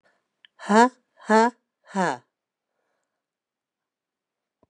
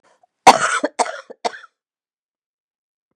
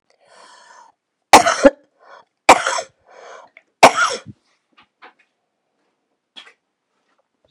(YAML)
exhalation_length: 4.7 s
exhalation_amplitude: 24206
exhalation_signal_mean_std_ratio: 0.25
cough_length: 3.2 s
cough_amplitude: 32768
cough_signal_mean_std_ratio: 0.25
three_cough_length: 7.5 s
three_cough_amplitude: 32768
three_cough_signal_mean_std_ratio: 0.23
survey_phase: beta (2021-08-13 to 2022-03-07)
age: 65+
gender: Female
wearing_mask: 'No'
symptom_new_continuous_cough: true
symptom_sore_throat: true
symptom_fatigue: true
symptom_onset: 12 days
smoker_status: Never smoked
respiratory_condition_asthma: true
respiratory_condition_other: false
recruitment_source: REACT
submission_delay: 1 day
covid_test_result: Negative
covid_test_method: RT-qPCR
influenza_a_test_result: Negative
influenza_b_test_result: Negative